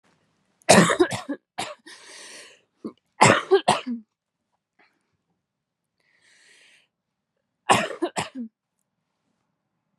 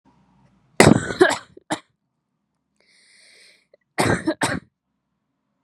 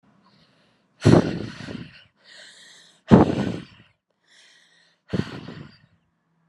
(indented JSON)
{
  "three_cough_length": "10.0 s",
  "three_cough_amplitude": 32748,
  "three_cough_signal_mean_std_ratio": 0.28,
  "cough_length": "5.6 s",
  "cough_amplitude": 32768,
  "cough_signal_mean_std_ratio": 0.28,
  "exhalation_length": "6.5 s",
  "exhalation_amplitude": 32768,
  "exhalation_signal_mean_std_ratio": 0.27,
  "survey_phase": "beta (2021-08-13 to 2022-03-07)",
  "age": "18-44",
  "gender": "Female",
  "wearing_mask": "No",
  "symptom_cough_any": true,
  "symptom_runny_or_blocked_nose": true,
  "symptom_shortness_of_breath": true,
  "symptom_fever_high_temperature": true,
  "symptom_change_to_sense_of_smell_or_taste": true,
  "symptom_loss_of_taste": true,
  "symptom_onset": "4 days",
  "smoker_status": "Ex-smoker",
  "respiratory_condition_asthma": true,
  "respiratory_condition_other": false,
  "recruitment_source": "Test and Trace",
  "submission_delay": "2 days",
  "covid_test_result": "Positive",
  "covid_test_method": "RT-qPCR",
  "covid_ct_value": 26.6,
  "covid_ct_gene": "ORF1ab gene"
}